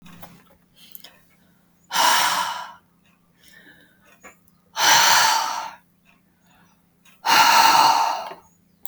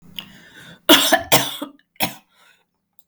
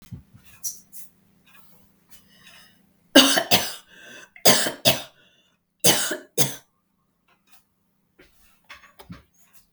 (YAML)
exhalation_length: 8.9 s
exhalation_amplitude: 26034
exhalation_signal_mean_std_ratio: 0.45
cough_length: 3.1 s
cough_amplitude: 32768
cough_signal_mean_std_ratio: 0.35
three_cough_length: 9.7 s
three_cough_amplitude: 32768
three_cough_signal_mean_std_ratio: 0.28
survey_phase: beta (2021-08-13 to 2022-03-07)
age: 65+
gender: Female
wearing_mask: 'No'
symptom_runny_or_blocked_nose: true
symptom_abdominal_pain: true
symptom_headache: true
symptom_onset: 12 days
smoker_status: Ex-smoker
respiratory_condition_asthma: false
respiratory_condition_other: true
recruitment_source: REACT
submission_delay: 3 days
covid_test_result: Negative
covid_test_method: RT-qPCR
influenza_a_test_result: Negative
influenza_b_test_result: Negative